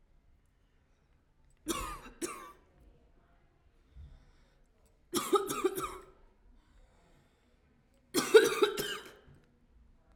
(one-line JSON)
{"three_cough_length": "10.2 s", "three_cough_amplitude": 13059, "three_cough_signal_mean_std_ratio": 0.28, "survey_phase": "alpha (2021-03-01 to 2021-08-12)", "age": "18-44", "gender": "Female", "wearing_mask": "No", "symptom_none": true, "symptom_onset": "13 days", "smoker_status": "Prefer not to say", "respiratory_condition_asthma": false, "respiratory_condition_other": false, "recruitment_source": "REACT", "submission_delay": "32 days", "covid_test_result": "Negative", "covid_test_method": "RT-qPCR"}